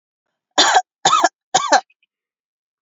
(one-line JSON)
{"three_cough_length": "2.8 s", "three_cough_amplitude": 32185, "three_cough_signal_mean_std_ratio": 0.39, "survey_phase": "beta (2021-08-13 to 2022-03-07)", "age": "45-64", "gender": "Female", "wearing_mask": "No", "symptom_none": true, "smoker_status": "Never smoked", "respiratory_condition_asthma": false, "respiratory_condition_other": false, "recruitment_source": "REACT", "submission_delay": "0 days", "covid_test_result": "Negative", "covid_test_method": "RT-qPCR", "influenza_a_test_result": "Negative", "influenza_b_test_result": "Negative"}